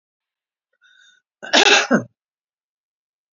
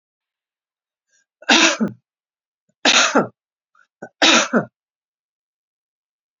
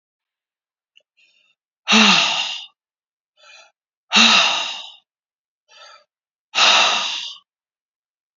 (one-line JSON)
{"cough_length": "3.3 s", "cough_amplitude": 30525, "cough_signal_mean_std_ratio": 0.28, "three_cough_length": "6.4 s", "three_cough_amplitude": 32416, "three_cough_signal_mean_std_ratio": 0.32, "exhalation_length": "8.4 s", "exhalation_amplitude": 30368, "exhalation_signal_mean_std_ratio": 0.38, "survey_phase": "beta (2021-08-13 to 2022-03-07)", "age": "45-64", "gender": "Female", "wearing_mask": "No", "symptom_none": true, "smoker_status": "Current smoker (e-cigarettes or vapes only)", "respiratory_condition_asthma": false, "respiratory_condition_other": false, "recruitment_source": "REACT", "submission_delay": "1 day", "covid_test_result": "Negative", "covid_test_method": "RT-qPCR"}